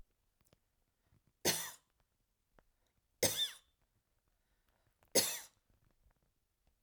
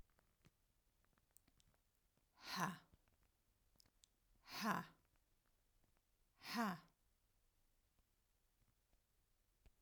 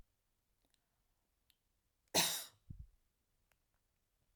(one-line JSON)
{"three_cough_length": "6.8 s", "three_cough_amplitude": 5713, "three_cough_signal_mean_std_ratio": 0.24, "exhalation_length": "9.8 s", "exhalation_amplitude": 1407, "exhalation_signal_mean_std_ratio": 0.28, "cough_length": "4.4 s", "cough_amplitude": 3995, "cough_signal_mean_std_ratio": 0.21, "survey_phase": "alpha (2021-03-01 to 2021-08-12)", "age": "65+", "gender": "Female", "wearing_mask": "No", "symptom_none": true, "smoker_status": "Never smoked", "respiratory_condition_asthma": false, "respiratory_condition_other": false, "recruitment_source": "REACT", "submission_delay": "1 day", "covid_test_result": "Negative", "covid_test_method": "RT-qPCR"}